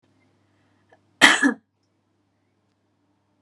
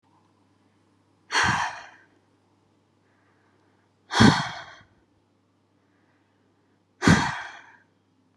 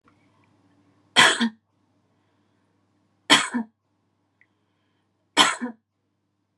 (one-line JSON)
{"cough_length": "3.4 s", "cough_amplitude": 32768, "cough_signal_mean_std_ratio": 0.22, "exhalation_length": "8.4 s", "exhalation_amplitude": 23686, "exhalation_signal_mean_std_ratio": 0.27, "three_cough_length": "6.6 s", "three_cough_amplitude": 32746, "three_cough_signal_mean_std_ratio": 0.25, "survey_phase": "beta (2021-08-13 to 2022-03-07)", "age": "18-44", "gender": "Female", "wearing_mask": "No", "symptom_sore_throat": true, "symptom_headache": true, "smoker_status": "Never smoked", "respiratory_condition_asthma": true, "respiratory_condition_other": false, "recruitment_source": "REACT", "submission_delay": "0 days", "covid_test_method": "RT-qPCR"}